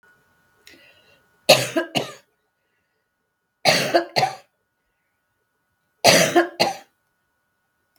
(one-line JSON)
{"three_cough_length": "8.0 s", "three_cough_amplitude": 32768, "three_cough_signal_mean_std_ratio": 0.31, "survey_phase": "beta (2021-08-13 to 2022-03-07)", "age": "65+", "gender": "Female", "wearing_mask": "No", "symptom_sore_throat": true, "symptom_onset": "12 days", "smoker_status": "Ex-smoker", "respiratory_condition_asthma": false, "respiratory_condition_other": false, "recruitment_source": "REACT", "submission_delay": "3 days", "covid_test_result": "Negative", "covid_test_method": "RT-qPCR"}